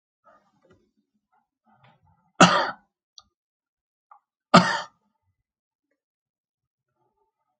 cough_length: 7.6 s
cough_amplitude: 30411
cough_signal_mean_std_ratio: 0.18
survey_phase: alpha (2021-03-01 to 2021-08-12)
age: 65+
gender: Male
wearing_mask: 'No'
symptom_cough_any: true
smoker_status: Ex-smoker
respiratory_condition_asthma: false
respiratory_condition_other: false
recruitment_source: REACT
submission_delay: 3 days
covid_test_result: Negative
covid_test_method: RT-qPCR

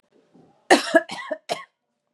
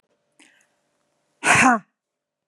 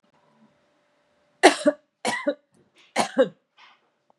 cough_length: 2.1 s
cough_amplitude: 30521
cough_signal_mean_std_ratio: 0.3
exhalation_length: 2.5 s
exhalation_amplitude: 27077
exhalation_signal_mean_std_ratio: 0.3
three_cough_length: 4.2 s
three_cough_amplitude: 32582
three_cough_signal_mean_std_ratio: 0.27
survey_phase: beta (2021-08-13 to 2022-03-07)
age: 45-64
gender: Female
wearing_mask: 'No'
symptom_none: true
symptom_onset: 5 days
smoker_status: Ex-smoker
respiratory_condition_asthma: false
respiratory_condition_other: false
recruitment_source: REACT
submission_delay: 2 days
covid_test_result: Negative
covid_test_method: RT-qPCR
influenza_a_test_result: Negative
influenza_b_test_result: Negative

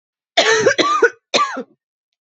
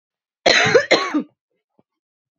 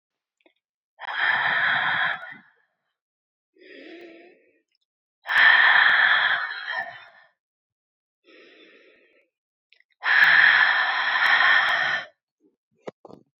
three_cough_length: 2.2 s
three_cough_amplitude: 30151
three_cough_signal_mean_std_ratio: 0.54
cough_length: 2.4 s
cough_amplitude: 32768
cough_signal_mean_std_ratio: 0.41
exhalation_length: 13.4 s
exhalation_amplitude: 21084
exhalation_signal_mean_std_ratio: 0.49
survey_phase: beta (2021-08-13 to 2022-03-07)
age: 18-44
gender: Female
wearing_mask: 'No'
symptom_cough_any: true
symptom_shortness_of_breath: true
symptom_sore_throat: true
symptom_onset: 10 days
smoker_status: Never smoked
respiratory_condition_asthma: false
respiratory_condition_other: false
recruitment_source: REACT
submission_delay: 1 day
covid_test_result: Negative
covid_test_method: RT-qPCR
influenza_a_test_result: Negative
influenza_b_test_result: Negative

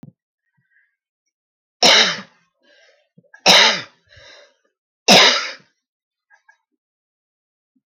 three_cough_length: 7.9 s
three_cough_amplitude: 32767
three_cough_signal_mean_std_ratio: 0.29
survey_phase: beta (2021-08-13 to 2022-03-07)
age: 45-64
gender: Female
wearing_mask: 'No'
symptom_none: true
smoker_status: Never smoked
respiratory_condition_asthma: false
respiratory_condition_other: false
recruitment_source: REACT
submission_delay: 2 days
covid_test_result: Negative
covid_test_method: RT-qPCR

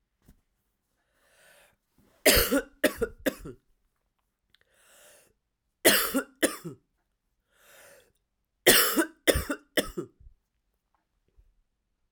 three_cough_length: 12.1 s
three_cough_amplitude: 20191
three_cough_signal_mean_std_ratio: 0.29
survey_phase: alpha (2021-03-01 to 2021-08-12)
age: 18-44
gender: Female
wearing_mask: 'No'
symptom_cough_any: true
symptom_diarrhoea: true
symptom_fatigue: true
symptom_headache: true
symptom_change_to_sense_of_smell_or_taste: true
smoker_status: Never smoked
respiratory_condition_asthma: true
respiratory_condition_other: false
recruitment_source: Test and Trace
submission_delay: 2 days
covid_test_result: Positive
covid_test_method: RT-qPCR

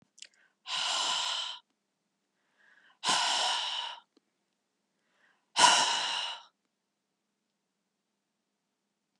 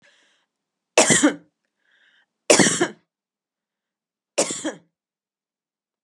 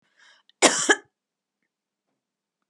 exhalation_length: 9.2 s
exhalation_amplitude: 16098
exhalation_signal_mean_std_ratio: 0.39
three_cough_length: 6.0 s
three_cough_amplitude: 32561
three_cough_signal_mean_std_ratio: 0.29
cough_length: 2.7 s
cough_amplitude: 29076
cough_signal_mean_std_ratio: 0.23
survey_phase: beta (2021-08-13 to 2022-03-07)
age: 45-64
gender: Female
wearing_mask: 'No'
symptom_none: true
smoker_status: Ex-smoker
respiratory_condition_asthma: false
respiratory_condition_other: false
recruitment_source: REACT
submission_delay: 2 days
covid_test_result: Negative
covid_test_method: RT-qPCR
influenza_a_test_result: Negative
influenza_b_test_result: Negative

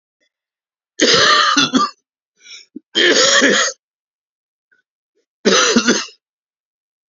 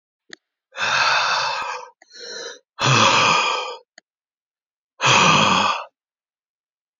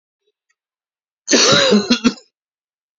three_cough_length: 7.1 s
three_cough_amplitude: 32768
three_cough_signal_mean_std_ratio: 0.47
exhalation_length: 7.0 s
exhalation_amplitude: 25147
exhalation_signal_mean_std_ratio: 0.54
cough_length: 3.0 s
cough_amplitude: 32767
cough_signal_mean_std_ratio: 0.41
survey_phase: beta (2021-08-13 to 2022-03-07)
age: 65+
gender: Male
wearing_mask: 'No'
symptom_runny_or_blocked_nose: true
symptom_sore_throat: true
smoker_status: Never smoked
respiratory_condition_asthma: false
respiratory_condition_other: true
recruitment_source: REACT
submission_delay: 1 day
covid_test_result: Negative
covid_test_method: RT-qPCR
influenza_a_test_result: Negative
influenza_b_test_result: Negative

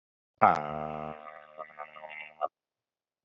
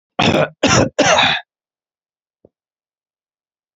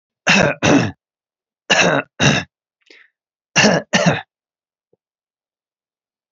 exhalation_length: 3.2 s
exhalation_amplitude: 16687
exhalation_signal_mean_std_ratio: 0.28
cough_length: 3.8 s
cough_amplitude: 32767
cough_signal_mean_std_ratio: 0.41
three_cough_length: 6.3 s
three_cough_amplitude: 30880
three_cough_signal_mean_std_ratio: 0.4
survey_phase: alpha (2021-03-01 to 2021-08-12)
age: 18-44
gender: Male
wearing_mask: 'No'
symptom_change_to_sense_of_smell_or_taste: true
symptom_loss_of_taste: true
symptom_onset: 12 days
smoker_status: Never smoked
respiratory_condition_asthma: false
respiratory_condition_other: false
recruitment_source: REACT
submission_delay: 2 days
covid_test_result: Negative
covid_test_method: RT-qPCR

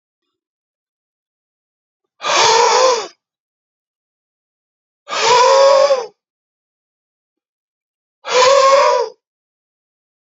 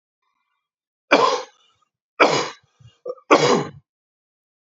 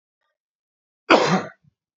exhalation_length: 10.2 s
exhalation_amplitude: 31042
exhalation_signal_mean_std_ratio: 0.42
three_cough_length: 4.8 s
three_cough_amplitude: 31805
three_cough_signal_mean_std_ratio: 0.34
cough_length: 2.0 s
cough_amplitude: 27909
cough_signal_mean_std_ratio: 0.3
survey_phase: beta (2021-08-13 to 2022-03-07)
age: 45-64
gender: Male
wearing_mask: 'No'
symptom_runny_or_blocked_nose: true
symptom_fatigue: true
symptom_headache: true
symptom_change_to_sense_of_smell_or_taste: true
symptom_loss_of_taste: true
smoker_status: Never smoked
respiratory_condition_asthma: false
respiratory_condition_other: false
recruitment_source: Test and Trace
submission_delay: 1 day
covid_test_result: Positive
covid_test_method: RT-qPCR
covid_ct_value: 18.3
covid_ct_gene: ORF1ab gene
covid_ct_mean: 18.5
covid_viral_load: 830000 copies/ml
covid_viral_load_category: Low viral load (10K-1M copies/ml)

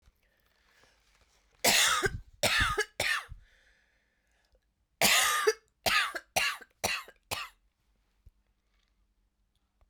three_cough_length: 9.9 s
three_cough_amplitude: 10249
three_cough_signal_mean_std_ratio: 0.4
survey_phase: beta (2021-08-13 to 2022-03-07)
age: 45-64
gender: Female
wearing_mask: 'No'
symptom_new_continuous_cough: true
symptom_runny_or_blocked_nose: true
symptom_sore_throat: true
symptom_diarrhoea: true
symptom_fatigue: true
symptom_fever_high_temperature: true
symptom_headache: true
symptom_change_to_sense_of_smell_or_taste: true
symptom_onset: 6 days
smoker_status: Never smoked
respiratory_condition_asthma: false
respiratory_condition_other: false
recruitment_source: Test and Trace
submission_delay: 2 days
covid_test_result: Positive
covid_test_method: RT-qPCR
covid_ct_value: 13.9
covid_ct_gene: ORF1ab gene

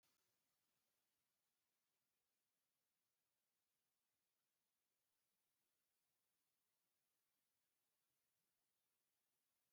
exhalation_length: 9.7 s
exhalation_amplitude: 10
exhalation_signal_mean_std_ratio: 0.69
survey_phase: beta (2021-08-13 to 2022-03-07)
age: 45-64
gender: Male
wearing_mask: 'No'
symptom_none: true
smoker_status: Never smoked
respiratory_condition_asthma: false
respiratory_condition_other: false
recruitment_source: REACT
submission_delay: 1 day
covid_test_result: Negative
covid_test_method: RT-qPCR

